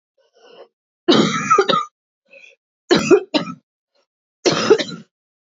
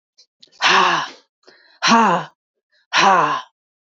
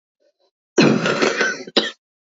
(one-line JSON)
{"three_cough_length": "5.5 s", "three_cough_amplitude": 27958, "three_cough_signal_mean_std_ratio": 0.41, "exhalation_length": "3.8 s", "exhalation_amplitude": 27033, "exhalation_signal_mean_std_ratio": 0.5, "cough_length": "2.3 s", "cough_amplitude": 27872, "cough_signal_mean_std_ratio": 0.5, "survey_phase": "beta (2021-08-13 to 2022-03-07)", "age": "18-44", "gender": "Female", "wearing_mask": "No", "symptom_cough_any": true, "symptom_runny_or_blocked_nose": true, "symptom_sore_throat": true, "symptom_headache": true, "symptom_onset": "12 days", "smoker_status": "Never smoked", "respiratory_condition_asthma": false, "respiratory_condition_other": false, "recruitment_source": "Test and Trace", "submission_delay": "6 days", "covid_test_result": "Negative", "covid_test_method": "RT-qPCR"}